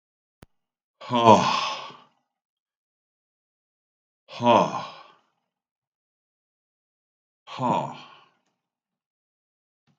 {"exhalation_length": "10.0 s", "exhalation_amplitude": 32766, "exhalation_signal_mean_std_ratio": 0.26, "survey_phase": "beta (2021-08-13 to 2022-03-07)", "age": "65+", "gender": "Male", "wearing_mask": "No", "symptom_cough_any": true, "symptom_onset": "8 days", "smoker_status": "Ex-smoker", "respiratory_condition_asthma": false, "respiratory_condition_other": false, "recruitment_source": "REACT", "submission_delay": "2 days", "covid_test_result": "Negative", "covid_test_method": "RT-qPCR", "influenza_a_test_result": "Negative", "influenza_b_test_result": "Negative"}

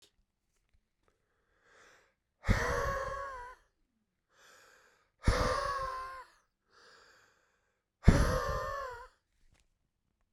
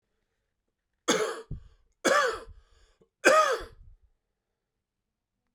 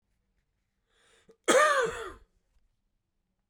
{"exhalation_length": "10.3 s", "exhalation_amplitude": 17282, "exhalation_signal_mean_std_ratio": 0.34, "three_cough_length": "5.5 s", "three_cough_amplitude": 17453, "three_cough_signal_mean_std_ratio": 0.33, "cough_length": "3.5 s", "cough_amplitude": 11658, "cough_signal_mean_std_ratio": 0.31, "survey_phase": "beta (2021-08-13 to 2022-03-07)", "age": "18-44", "gender": "Male", "wearing_mask": "No", "symptom_cough_any": true, "symptom_runny_or_blocked_nose": true, "symptom_headache": true, "symptom_change_to_sense_of_smell_or_taste": true, "symptom_other": true, "smoker_status": "Never smoked", "respiratory_condition_asthma": false, "respiratory_condition_other": false, "recruitment_source": "Test and Trace", "submission_delay": "1 day", "covid_test_result": "Positive", "covid_test_method": "RT-qPCR", "covid_ct_value": 16.4, "covid_ct_gene": "ORF1ab gene", "covid_ct_mean": 16.9, "covid_viral_load": "2800000 copies/ml", "covid_viral_load_category": "High viral load (>1M copies/ml)"}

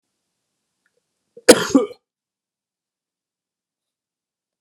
{"cough_length": "4.6 s", "cough_amplitude": 32768, "cough_signal_mean_std_ratio": 0.16, "survey_phase": "beta (2021-08-13 to 2022-03-07)", "age": "18-44", "gender": "Male", "wearing_mask": "No", "symptom_cough_any": true, "symptom_runny_or_blocked_nose": true, "symptom_sore_throat": true, "symptom_fatigue": true, "symptom_fever_high_temperature": true, "symptom_headache": true, "symptom_onset": "3 days", "smoker_status": "Never smoked", "respiratory_condition_asthma": false, "respiratory_condition_other": false, "recruitment_source": "Test and Trace", "submission_delay": "2 days", "covid_test_result": "Positive", "covid_test_method": "RT-qPCR", "covid_ct_value": 14.4, "covid_ct_gene": "S gene"}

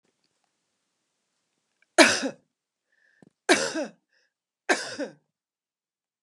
{"three_cough_length": "6.2 s", "three_cough_amplitude": 29778, "three_cough_signal_mean_std_ratio": 0.24, "survey_phase": "beta (2021-08-13 to 2022-03-07)", "age": "45-64", "gender": "Female", "wearing_mask": "No", "symptom_none": true, "smoker_status": "Ex-smoker", "respiratory_condition_asthma": false, "respiratory_condition_other": false, "recruitment_source": "REACT", "submission_delay": "2 days", "covid_test_result": "Negative", "covid_test_method": "RT-qPCR", "influenza_a_test_result": "Negative", "influenza_b_test_result": "Negative"}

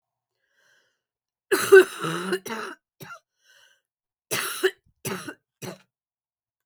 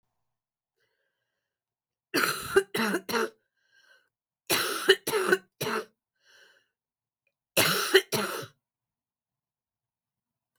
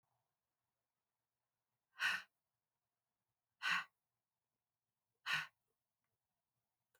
{"cough_length": "6.7 s", "cough_amplitude": 26272, "cough_signal_mean_std_ratio": 0.26, "three_cough_length": "10.6 s", "three_cough_amplitude": 19746, "three_cough_signal_mean_std_ratio": 0.35, "exhalation_length": "7.0 s", "exhalation_amplitude": 1730, "exhalation_signal_mean_std_ratio": 0.23, "survey_phase": "beta (2021-08-13 to 2022-03-07)", "age": "45-64", "gender": "Female", "wearing_mask": "No", "symptom_cough_any": true, "symptom_new_continuous_cough": true, "symptom_runny_or_blocked_nose": true, "symptom_headache": true, "symptom_other": true, "symptom_onset": "4 days", "smoker_status": "Never smoked", "respiratory_condition_asthma": false, "respiratory_condition_other": false, "recruitment_source": "Test and Trace", "submission_delay": "1 day", "covid_test_result": "Positive", "covid_test_method": "ePCR"}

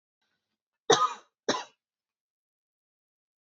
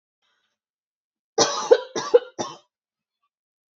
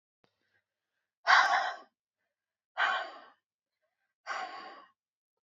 {"cough_length": "3.4 s", "cough_amplitude": 15373, "cough_signal_mean_std_ratio": 0.22, "three_cough_length": "3.8 s", "three_cough_amplitude": 26743, "three_cough_signal_mean_std_ratio": 0.26, "exhalation_length": "5.5 s", "exhalation_amplitude": 11970, "exhalation_signal_mean_std_ratio": 0.31, "survey_phase": "beta (2021-08-13 to 2022-03-07)", "age": "18-44", "gender": "Female", "wearing_mask": "No", "symptom_cough_any": true, "symptom_runny_or_blocked_nose": true, "symptom_fatigue": true, "symptom_fever_high_temperature": true, "symptom_headache": true, "symptom_other": true, "symptom_onset": "2 days", "smoker_status": "Ex-smoker", "respiratory_condition_asthma": false, "respiratory_condition_other": false, "recruitment_source": "Test and Trace", "submission_delay": "2 days", "covid_test_result": "Positive", "covid_test_method": "RT-qPCR", "covid_ct_value": 16.6, "covid_ct_gene": "ORF1ab gene", "covid_ct_mean": 16.9, "covid_viral_load": "2900000 copies/ml", "covid_viral_load_category": "High viral load (>1M copies/ml)"}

